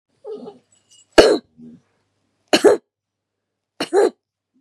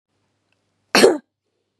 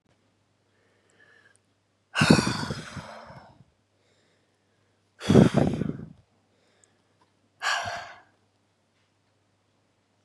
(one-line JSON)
{"three_cough_length": "4.6 s", "three_cough_amplitude": 32768, "three_cough_signal_mean_std_ratio": 0.29, "cough_length": "1.8 s", "cough_amplitude": 32767, "cough_signal_mean_std_ratio": 0.27, "exhalation_length": "10.2 s", "exhalation_amplitude": 26949, "exhalation_signal_mean_std_ratio": 0.27, "survey_phase": "beta (2021-08-13 to 2022-03-07)", "age": "45-64", "gender": "Female", "wearing_mask": "No", "symptom_none": true, "smoker_status": "Never smoked", "respiratory_condition_asthma": false, "respiratory_condition_other": false, "recruitment_source": "REACT", "submission_delay": "0 days", "covid_test_result": "Negative", "covid_test_method": "RT-qPCR", "influenza_a_test_result": "Negative", "influenza_b_test_result": "Negative"}